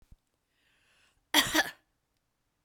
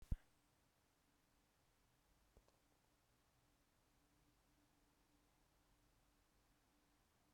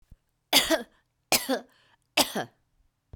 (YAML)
cough_length: 2.6 s
cough_amplitude: 12786
cough_signal_mean_std_ratio: 0.25
exhalation_length: 7.3 s
exhalation_amplitude: 1247
exhalation_signal_mean_std_ratio: 0.16
three_cough_length: 3.2 s
three_cough_amplitude: 18666
three_cough_signal_mean_std_ratio: 0.34
survey_phase: beta (2021-08-13 to 2022-03-07)
age: 65+
gender: Female
wearing_mask: 'No'
symptom_new_continuous_cough: true
symptom_runny_or_blocked_nose: true
symptom_headache: true
symptom_change_to_sense_of_smell_or_taste: true
symptom_loss_of_taste: true
symptom_onset: 5 days
smoker_status: Never smoked
respiratory_condition_asthma: false
respiratory_condition_other: false
recruitment_source: Test and Trace
submission_delay: 2 days
covid_test_result: Positive
covid_test_method: RT-qPCR
covid_ct_value: 19.5
covid_ct_gene: ORF1ab gene